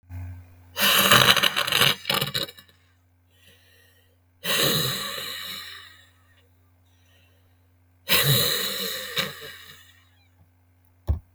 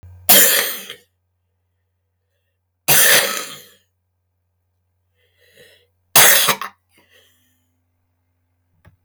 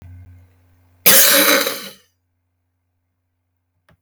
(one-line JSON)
{"exhalation_length": "11.3 s", "exhalation_amplitude": 32768, "exhalation_signal_mean_std_ratio": 0.44, "three_cough_length": "9.0 s", "three_cough_amplitude": 32768, "three_cough_signal_mean_std_ratio": 0.32, "cough_length": "4.0 s", "cough_amplitude": 32768, "cough_signal_mean_std_ratio": 0.35, "survey_phase": "beta (2021-08-13 to 2022-03-07)", "age": "65+", "gender": "Female", "wearing_mask": "No", "symptom_cough_any": true, "smoker_status": "Ex-smoker", "respiratory_condition_asthma": true, "respiratory_condition_other": true, "recruitment_source": "REACT", "submission_delay": "2 days", "covid_test_result": "Negative", "covid_test_method": "RT-qPCR", "influenza_a_test_result": "Negative", "influenza_b_test_result": "Negative"}